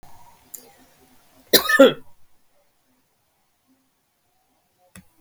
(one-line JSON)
{"cough_length": "5.2 s", "cough_amplitude": 32768, "cough_signal_mean_std_ratio": 0.2, "survey_phase": "beta (2021-08-13 to 2022-03-07)", "age": "65+", "gender": "Female", "wearing_mask": "No", "symptom_none": true, "smoker_status": "Ex-smoker", "respiratory_condition_asthma": true, "respiratory_condition_other": false, "recruitment_source": "REACT", "submission_delay": "1 day", "covid_test_result": "Negative", "covid_test_method": "RT-qPCR", "influenza_a_test_result": "Negative", "influenza_b_test_result": "Negative"}